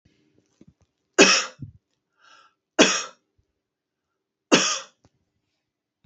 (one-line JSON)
{"three_cough_length": "6.1 s", "three_cough_amplitude": 32767, "three_cough_signal_mean_std_ratio": 0.26, "survey_phase": "beta (2021-08-13 to 2022-03-07)", "age": "45-64", "gender": "Female", "wearing_mask": "No", "symptom_none": true, "smoker_status": "Never smoked", "respiratory_condition_asthma": false, "respiratory_condition_other": false, "recruitment_source": "REACT", "submission_delay": "31 days", "covid_test_result": "Negative", "covid_test_method": "RT-qPCR", "influenza_a_test_result": "Unknown/Void", "influenza_b_test_result": "Unknown/Void"}